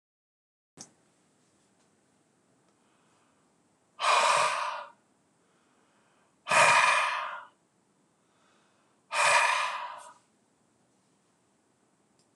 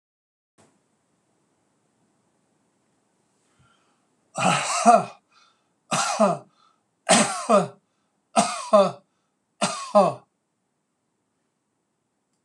{
  "exhalation_length": "12.4 s",
  "exhalation_amplitude": 11478,
  "exhalation_signal_mean_std_ratio": 0.35,
  "cough_length": "12.4 s",
  "cough_amplitude": 23345,
  "cough_signal_mean_std_ratio": 0.32,
  "survey_phase": "beta (2021-08-13 to 2022-03-07)",
  "age": "65+",
  "gender": "Male",
  "wearing_mask": "No",
  "symptom_none": true,
  "smoker_status": "Ex-smoker",
  "respiratory_condition_asthma": false,
  "respiratory_condition_other": false,
  "recruitment_source": "REACT",
  "submission_delay": "3 days",
  "covid_test_result": "Negative",
  "covid_test_method": "RT-qPCR"
}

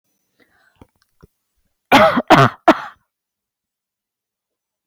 {
  "three_cough_length": "4.9 s",
  "three_cough_amplitude": 32767,
  "three_cough_signal_mean_std_ratio": 0.27,
  "survey_phase": "beta (2021-08-13 to 2022-03-07)",
  "age": "18-44",
  "gender": "Female",
  "wearing_mask": "No",
  "symptom_cough_any": true,
  "symptom_sore_throat": true,
  "symptom_headache": true,
  "symptom_change_to_sense_of_smell_or_taste": true,
  "symptom_loss_of_taste": true,
  "symptom_onset": "2 days",
  "smoker_status": "Ex-smoker",
  "respiratory_condition_asthma": false,
  "respiratory_condition_other": false,
  "recruitment_source": "Test and Trace",
  "submission_delay": "2 days",
  "covid_test_result": "Positive",
  "covid_test_method": "RT-qPCR",
  "covid_ct_value": 33.1,
  "covid_ct_gene": "ORF1ab gene"
}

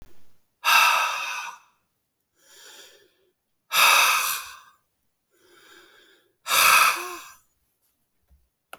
{
  "exhalation_length": "8.8 s",
  "exhalation_amplitude": 20396,
  "exhalation_signal_mean_std_ratio": 0.39,
  "survey_phase": "beta (2021-08-13 to 2022-03-07)",
  "age": "65+",
  "gender": "Male",
  "wearing_mask": "No",
  "symptom_none": true,
  "smoker_status": "Never smoked",
  "respiratory_condition_asthma": false,
  "respiratory_condition_other": false,
  "recruitment_source": "REACT",
  "submission_delay": "1 day",
  "covid_test_result": "Negative",
  "covid_test_method": "RT-qPCR"
}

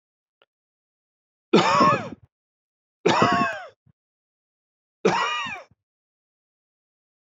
{
  "three_cough_length": "7.3 s",
  "three_cough_amplitude": 19585,
  "three_cough_signal_mean_std_ratio": 0.35,
  "survey_phase": "beta (2021-08-13 to 2022-03-07)",
  "age": "18-44",
  "gender": "Male",
  "wearing_mask": "No",
  "symptom_none": true,
  "symptom_onset": "3 days",
  "smoker_status": "Never smoked",
  "respiratory_condition_asthma": false,
  "respiratory_condition_other": false,
  "recruitment_source": "REACT",
  "submission_delay": "2 days",
  "covid_test_result": "Negative",
  "covid_test_method": "RT-qPCR",
  "influenza_a_test_result": "Negative",
  "influenza_b_test_result": "Negative"
}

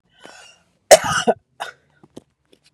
{
  "cough_length": "2.7 s",
  "cough_amplitude": 32768,
  "cough_signal_mean_std_ratio": 0.24,
  "survey_phase": "beta (2021-08-13 to 2022-03-07)",
  "age": "45-64",
  "gender": "Female",
  "wearing_mask": "No",
  "symptom_runny_or_blocked_nose": true,
  "symptom_shortness_of_breath": true,
  "smoker_status": "Never smoked",
  "respiratory_condition_asthma": true,
  "respiratory_condition_other": false,
  "recruitment_source": "REACT",
  "submission_delay": "2 days",
  "covid_test_result": "Negative",
  "covid_test_method": "RT-qPCR",
  "influenza_a_test_result": "Unknown/Void",
  "influenza_b_test_result": "Unknown/Void"
}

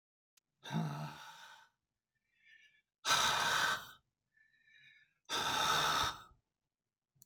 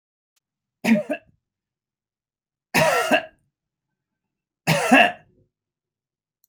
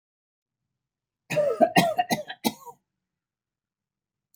{
  "exhalation_length": "7.3 s",
  "exhalation_amplitude": 3983,
  "exhalation_signal_mean_std_ratio": 0.46,
  "three_cough_length": "6.5 s",
  "three_cough_amplitude": 25669,
  "three_cough_signal_mean_std_ratio": 0.32,
  "cough_length": "4.4 s",
  "cough_amplitude": 16602,
  "cough_signal_mean_std_ratio": 0.33,
  "survey_phase": "beta (2021-08-13 to 2022-03-07)",
  "age": "65+",
  "gender": "Male",
  "wearing_mask": "No",
  "symptom_none": true,
  "smoker_status": "Ex-smoker",
  "respiratory_condition_asthma": false,
  "respiratory_condition_other": false,
  "recruitment_source": "REACT",
  "submission_delay": "1 day",
  "covid_test_result": "Negative",
  "covid_test_method": "RT-qPCR",
  "influenza_a_test_result": "Negative",
  "influenza_b_test_result": "Negative"
}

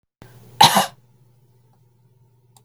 {
  "cough_length": "2.6 s",
  "cough_amplitude": 32768,
  "cough_signal_mean_std_ratio": 0.24,
  "survey_phase": "beta (2021-08-13 to 2022-03-07)",
  "age": "45-64",
  "gender": "Female",
  "wearing_mask": "No",
  "symptom_abdominal_pain": true,
  "smoker_status": "Never smoked",
  "respiratory_condition_asthma": true,
  "respiratory_condition_other": false,
  "recruitment_source": "REACT",
  "submission_delay": "2 days",
  "covid_test_result": "Negative",
  "covid_test_method": "RT-qPCR",
  "influenza_a_test_result": "Negative",
  "influenza_b_test_result": "Negative"
}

